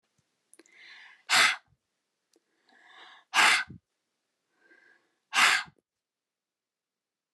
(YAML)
exhalation_length: 7.3 s
exhalation_amplitude: 13086
exhalation_signal_mean_std_ratio: 0.27
survey_phase: alpha (2021-03-01 to 2021-08-12)
age: 45-64
gender: Female
wearing_mask: 'No'
symptom_none: true
smoker_status: Never smoked
respiratory_condition_asthma: false
respiratory_condition_other: false
recruitment_source: REACT
submission_delay: 1 day
covid_test_result: Negative
covid_test_method: RT-qPCR